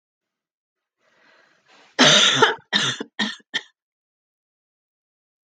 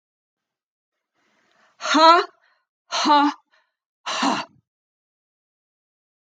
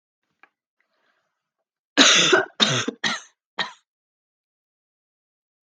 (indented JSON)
{
  "three_cough_length": "5.5 s",
  "three_cough_amplitude": 31685,
  "three_cough_signal_mean_std_ratio": 0.31,
  "exhalation_length": "6.3 s",
  "exhalation_amplitude": 30962,
  "exhalation_signal_mean_std_ratio": 0.31,
  "cough_length": "5.6 s",
  "cough_amplitude": 32396,
  "cough_signal_mean_std_ratio": 0.31,
  "survey_phase": "beta (2021-08-13 to 2022-03-07)",
  "age": "45-64",
  "gender": "Female",
  "wearing_mask": "No",
  "symptom_none": true,
  "smoker_status": "Never smoked",
  "respiratory_condition_asthma": false,
  "respiratory_condition_other": false,
  "recruitment_source": "Test and Trace",
  "submission_delay": "1 day",
  "covid_test_result": "Negative",
  "covid_test_method": "RT-qPCR"
}